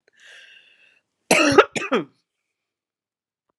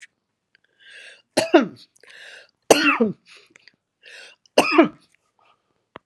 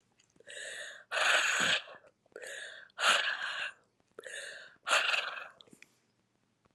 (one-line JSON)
{"cough_length": "3.6 s", "cough_amplitude": 32768, "cough_signal_mean_std_ratio": 0.28, "three_cough_length": "6.1 s", "three_cough_amplitude": 32768, "three_cough_signal_mean_std_ratio": 0.29, "exhalation_length": "6.7 s", "exhalation_amplitude": 7556, "exhalation_signal_mean_std_ratio": 0.49, "survey_phase": "alpha (2021-03-01 to 2021-08-12)", "age": "65+", "gender": "Female", "wearing_mask": "No", "symptom_cough_any": true, "symptom_headache": true, "symptom_onset": "4 days", "smoker_status": "Never smoked", "respiratory_condition_asthma": false, "respiratory_condition_other": false, "recruitment_source": "Test and Trace", "submission_delay": "1 day", "covid_test_result": "Positive", "covid_test_method": "RT-qPCR"}